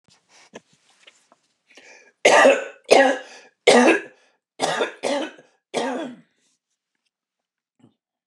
cough_length: 8.3 s
cough_amplitude: 29203
cough_signal_mean_std_ratio: 0.34
survey_phase: beta (2021-08-13 to 2022-03-07)
age: 65+
gender: Male
wearing_mask: 'No'
symptom_runny_or_blocked_nose: true
smoker_status: Ex-smoker
respiratory_condition_asthma: false
respiratory_condition_other: false
recruitment_source: REACT
submission_delay: 1 day
covid_test_result: Negative
covid_test_method: RT-qPCR
influenza_a_test_result: Negative
influenza_b_test_result: Negative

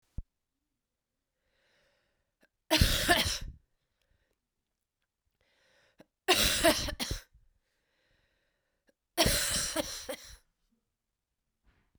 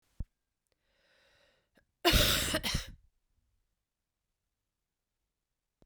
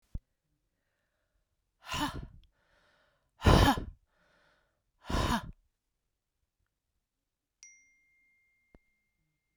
three_cough_length: 12.0 s
three_cough_amplitude: 12689
three_cough_signal_mean_std_ratio: 0.33
cough_length: 5.9 s
cough_amplitude: 8436
cough_signal_mean_std_ratio: 0.28
exhalation_length: 9.6 s
exhalation_amplitude: 11641
exhalation_signal_mean_std_ratio: 0.23
survey_phase: beta (2021-08-13 to 2022-03-07)
age: 45-64
gender: Female
wearing_mask: 'No'
symptom_cough_any: true
symptom_runny_or_blocked_nose: true
symptom_shortness_of_breath: true
symptom_change_to_sense_of_smell_or_taste: true
symptom_other: true
symptom_onset: 3 days
smoker_status: Never smoked
respiratory_condition_asthma: false
respiratory_condition_other: false
recruitment_source: Test and Trace
submission_delay: 2 days
covid_test_result: Positive
covid_test_method: ePCR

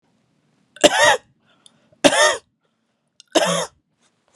three_cough_length: 4.4 s
three_cough_amplitude: 32768
three_cough_signal_mean_std_ratio: 0.35
survey_phase: beta (2021-08-13 to 2022-03-07)
age: 18-44
gender: Female
wearing_mask: 'No'
symptom_none: true
smoker_status: Never smoked
respiratory_condition_asthma: false
respiratory_condition_other: false
recruitment_source: REACT
submission_delay: 0 days
covid_test_result: Negative
covid_test_method: RT-qPCR
influenza_a_test_result: Negative
influenza_b_test_result: Negative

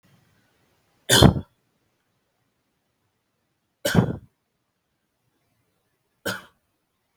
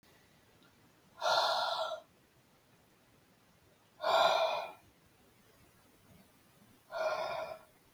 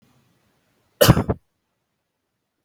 three_cough_length: 7.2 s
three_cough_amplitude: 32768
three_cough_signal_mean_std_ratio: 0.2
exhalation_length: 7.9 s
exhalation_amplitude: 5173
exhalation_signal_mean_std_ratio: 0.42
cough_length: 2.6 s
cough_amplitude: 32767
cough_signal_mean_std_ratio: 0.22
survey_phase: beta (2021-08-13 to 2022-03-07)
age: 18-44
gender: Male
wearing_mask: 'No'
symptom_none: true
smoker_status: Never smoked
respiratory_condition_asthma: false
respiratory_condition_other: false
recruitment_source: REACT
submission_delay: 2 days
covid_test_result: Negative
covid_test_method: RT-qPCR
influenza_a_test_result: Unknown/Void
influenza_b_test_result: Unknown/Void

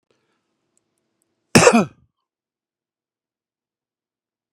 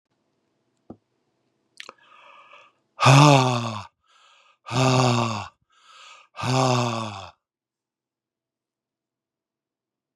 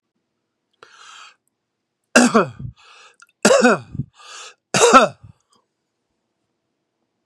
cough_length: 4.5 s
cough_amplitude: 32768
cough_signal_mean_std_ratio: 0.19
exhalation_length: 10.2 s
exhalation_amplitude: 32737
exhalation_signal_mean_std_ratio: 0.34
three_cough_length: 7.3 s
three_cough_amplitude: 32768
three_cough_signal_mean_std_ratio: 0.3
survey_phase: beta (2021-08-13 to 2022-03-07)
age: 45-64
gender: Male
wearing_mask: 'No'
symptom_none: true
symptom_onset: 12 days
smoker_status: Never smoked
respiratory_condition_asthma: false
respiratory_condition_other: false
recruitment_source: REACT
submission_delay: 2 days
covid_test_result: Negative
covid_test_method: RT-qPCR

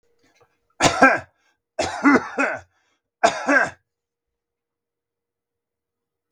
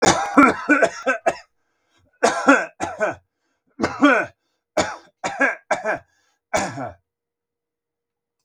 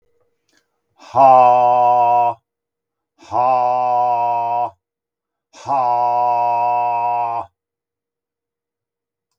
three_cough_length: 6.3 s
three_cough_amplitude: 32768
three_cough_signal_mean_std_ratio: 0.33
cough_length: 8.4 s
cough_amplitude: 32768
cough_signal_mean_std_ratio: 0.43
exhalation_length: 9.4 s
exhalation_amplitude: 32768
exhalation_signal_mean_std_ratio: 0.6
survey_phase: beta (2021-08-13 to 2022-03-07)
age: 65+
gender: Male
wearing_mask: 'No'
symptom_fatigue: true
smoker_status: Never smoked
respiratory_condition_asthma: false
respiratory_condition_other: false
recruitment_source: Test and Trace
submission_delay: 2 days
covid_test_result: Positive
covid_test_method: RT-qPCR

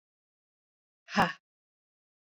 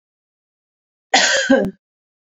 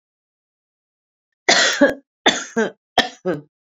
exhalation_length: 2.4 s
exhalation_amplitude: 8988
exhalation_signal_mean_std_ratio: 0.19
cough_length: 2.3 s
cough_amplitude: 28586
cough_signal_mean_std_ratio: 0.39
three_cough_length: 3.8 s
three_cough_amplitude: 31622
three_cough_signal_mean_std_ratio: 0.37
survey_phase: beta (2021-08-13 to 2022-03-07)
age: 45-64
gender: Female
wearing_mask: 'No'
symptom_cough_any: true
symptom_runny_or_blocked_nose: true
symptom_fatigue: true
symptom_headache: true
symptom_change_to_sense_of_smell_or_taste: true
symptom_onset: 3 days
smoker_status: Current smoker (1 to 10 cigarettes per day)
respiratory_condition_asthma: false
respiratory_condition_other: false
recruitment_source: Test and Trace
submission_delay: 2 days
covid_test_result: Positive
covid_test_method: ePCR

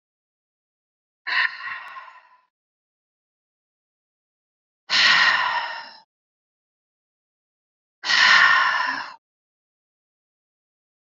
exhalation_length: 11.2 s
exhalation_amplitude: 22384
exhalation_signal_mean_std_ratio: 0.35
survey_phase: beta (2021-08-13 to 2022-03-07)
age: 45-64
gender: Female
wearing_mask: 'No'
symptom_cough_any: true
symptom_sore_throat: true
symptom_change_to_sense_of_smell_or_taste: true
symptom_onset: 4 days
smoker_status: Never smoked
respiratory_condition_asthma: false
respiratory_condition_other: false
recruitment_source: Test and Trace
submission_delay: 1 day
covid_test_result: Positive
covid_test_method: RT-qPCR
covid_ct_value: 14.7
covid_ct_gene: ORF1ab gene
covid_ct_mean: 14.9
covid_viral_load: 13000000 copies/ml
covid_viral_load_category: High viral load (>1M copies/ml)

